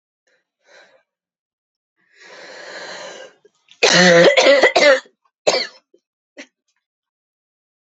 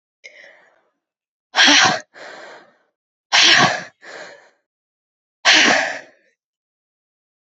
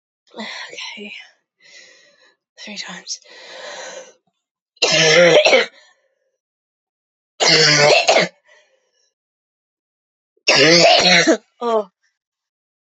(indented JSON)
{
  "cough_length": "7.9 s",
  "cough_amplitude": 32327,
  "cough_signal_mean_std_ratio": 0.35,
  "exhalation_length": "7.6 s",
  "exhalation_amplitude": 32406,
  "exhalation_signal_mean_std_ratio": 0.36,
  "three_cough_length": "13.0 s",
  "three_cough_amplitude": 32649,
  "three_cough_signal_mean_std_ratio": 0.41,
  "survey_phase": "beta (2021-08-13 to 2022-03-07)",
  "age": "18-44",
  "gender": "Female",
  "wearing_mask": "No",
  "symptom_cough_any": true,
  "symptom_runny_or_blocked_nose": true,
  "symptom_shortness_of_breath": true,
  "symptom_sore_throat": true,
  "symptom_fatigue": true,
  "symptom_fever_high_temperature": true,
  "symptom_headache": true,
  "symptom_other": true,
  "symptom_onset": "3 days",
  "smoker_status": "Never smoked",
  "respiratory_condition_asthma": true,
  "respiratory_condition_other": false,
  "recruitment_source": "Test and Trace",
  "submission_delay": "2 days",
  "covid_test_result": "Negative",
  "covid_test_method": "RT-qPCR"
}